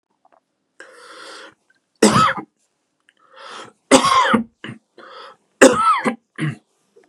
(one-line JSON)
{"three_cough_length": "7.1 s", "three_cough_amplitude": 32768, "three_cough_signal_mean_std_ratio": 0.37, "survey_phase": "beta (2021-08-13 to 2022-03-07)", "age": "45-64", "gender": "Male", "wearing_mask": "No", "symptom_none": true, "smoker_status": "Ex-smoker", "respiratory_condition_asthma": false, "respiratory_condition_other": false, "recruitment_source": "REACT", "submission_delay": "7 days", "covid_test_result": "Negative", "covid_test_method": "RT-qPCR", "influenza_a_test_result": "Negative", "influenza_b_test_result": "Negative"}